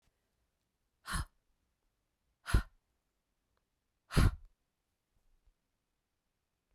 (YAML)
exhalation_length: 6.7 s
exhalation_amplitude: 5507
exhalation_signal_mean_std_ratio: 0.19
survey_phase: beta (2021-08-13 to 2022-03-07)
age: 45-64
gender: Female
wearing_mask: 'No'
symptom_runny_or_blocked_nose: true
symptom_sore_throat: true
symptom_abdominal_pain: true
symptom_fatigue: true
symptom_headache: true
symptom_change_to_sense_of_smell_or_taste: true
symptom_other: true
symptom_onset: 7 days
smoker_status: Ex-smoker
respiratory_condition_asthma: false
respiratory_condition_other: false
recruitment_source: Test and Trace
submission_delay: 2 days
covid_test_result: Positive
covid_test_method: ePCR